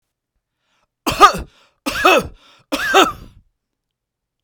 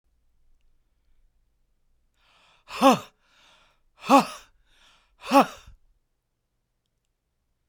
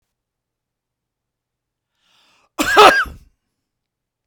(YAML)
three_cough_length: 4.4 s
three_cough_amplitude: 32768
three_cough_signal_mean_std_ratio: 0.34
exhalation_length: 7.7 s
exhalation_amplitude: 20508
exhalation_signal_mean_std_ratio: 0.21
cough_length: 4.3 s
cough_amplitude: 32768
cough_signal_mean_std_ratio: 0.24
survey_phase: beta (2021-08-13 to 2022-03-07)
age: 65+
gender: Male
wearing_mask: 'No'
symptom_none: true
smoker_status: Never smoked
respiratory_condition_asthma: false
respiratory_condition_other: false
recruitment_source: REACT
submission_delay: 1 day
covid_test_result: Negative
covid_test_method: RT-qPCR